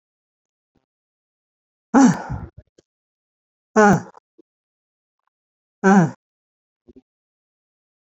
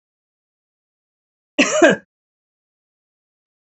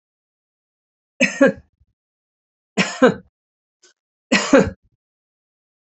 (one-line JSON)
{"exhalation_length": "8.2 s", "exhalation_amplitude": 29205, "exhalation_signal_mean_std_ratio": 0.24, "cough_length": "3.7 s", "cough_amplitude": 28455, "cough_signal_mean_std_ratio": 0.23, "three_cough_length": "5.9 s", "three_cough_amplitude": 27569, "three_cough_signal_mean_std_ratio": 0.27, "survey_phase": "beta (2021-08-13 to 2022-03-07)", "age": "45-64", "gender": "Female", "wearing_mask": "No", "symptom_none": true, "smoker_status": "Never smoked", "respiratory_condition_asthma": false, "respiratory_condition_other": false, "recruitment_source": "REACT", "submission_delay": "1 day", "covid_test_result": "Negative", "covid_test_method": "RT-qPCR", "influenza_a_test_result": "Unknown/Void", "influenza_b_test_result": "Unknown/Void"}